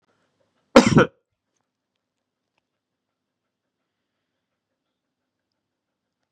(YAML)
cough_length: 6.3 s
cough_amplitude: 32768
cough_signal_mean_std_ratio: 0.14
survey_phase: beta (2021-08-13 to 2022-03-07)
age: 45-64
gender: Male
wearing_mask: 'No'
symptom_none: true
smoker_status: Current smoker (1 to 10 cigarettes per day)
respiratory_condition_asthma: false
respiratory_condition_other: false
recruitment_source: REACT
submission_delay: 2 days
covid_test_result: Negative
covid_test_method: RT-qPCR